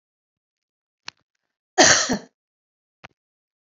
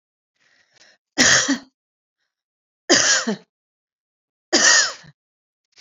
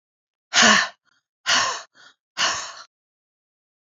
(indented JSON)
{
  "cough_length": "3.7 s",
  "cough_amplitude": 32767,
  "cough_signal_mean_std_ratio": 0.24,
  "three_cough_length": "5.8 s",
  "three_cough_amplitude": 30858,
  "three_cough_signal_mean_std_ratio": 0.36,
  "exhalation_length": "3.9 s",
  "exhalation_amplitude": 27833,
  "exhalation_signal_mean_std_ratio": 0.36,
  "survey_phase": "beta (2021-08-13 to 2022-03-07)",
  "age": "45-64",
  "gender": "Female",
  "wearing_mask": "No",
  "symptom_none": true,
  "smoker_status": "Never smoked",
  "respiratory_condition_asthma": false,
  "respiratory_condition_other": false,
  "recruitment_source": "REACT",
  "submission_delay": "1 day",
  "covid_test_result": "Negative",
  "covid_test_method": "RT-qPCR"
}